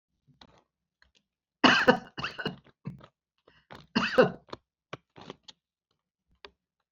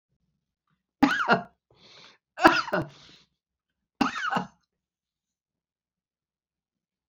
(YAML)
cough_length: 6.9 s
cough_amplitude: 17363
cough_signal_mean_std_ratio: 0.25
three_cough_length: 7.1 s
three_cough_amplitude: 26651
three_cough_signal_mean_std_ratio: 0.27
survey_phase: beta (2021-08-13 to 2022-03-07)
age: 65+
gender: Female
wearing_mask: 'No'
symptom_cough_any: true
symptom_runny_or_blocked_nose: true
symptom_fatigue: true
symptom_onset: 5 days
smoker_status: Never smoked
respiratory_condition_asthma: false
respiratory_condition_other: false
recruitment_source: REACT
submission_delay: 2 days
covid_test_result: Negative
covid_test_method: RT-qPCR